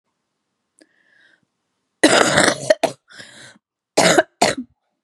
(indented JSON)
{
  "cough_length": "5.0 s",
  "cough_amplitude": 32768,
  "cough_signal_mean_std_ratio": 0.35,
  "survey_phase": "beta (2021-08-13 to 2022-03-07)",
  "age": "18-44",
  "gender": "Female",
  "wearing_mask": "No",
  "symptom_cough_any": true,
  "symptom_new_continuous_cough": true,
  "symptom_sore_throat": true,
  "symptom_headache": true,
  "symptom_other": true,
  "smoker_status": "Never smoked",
  "respiratory_condition_asthma": false,
  "respiratory_condition_other": false,
  "recruitment_source": "Test and Trace",
  "submission_delay": "-1 day",
  "covid_test_result": "Positive",
  "covid_test_method": "LFT"
}